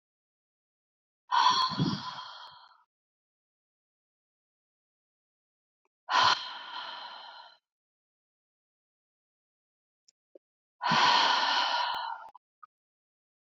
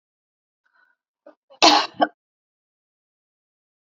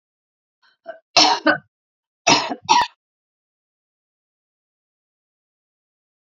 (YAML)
exhalation_length: 13.5 s
exhalation_amplitude: 8044
exhalation_signal_mean_std_ratio: 0.36
cough_length: 3.9 s
cough_amplitude: 31567
cough_signal_mean_std_ratio: 0.21
three_cough_length: 6.2 s
three_cough_amplitude: 32768
three_cough_signal_mean_std_ratio: 0.26
survey_phase: beta (2021-08-13 to 2022-03-07)
age: 45-64
gender: Female
wearing_mask: 'No'
symptom_runny_or_blocked_nose: true
symptom_fatigue: true
smoker_status: Never smoked
respiratory_condition_asthma: false
respiratory_condition_other: false
recruitment_source: Test and Trace
submission_delay: 1 day
covid_test_result: Positive
covid_test_method: LFT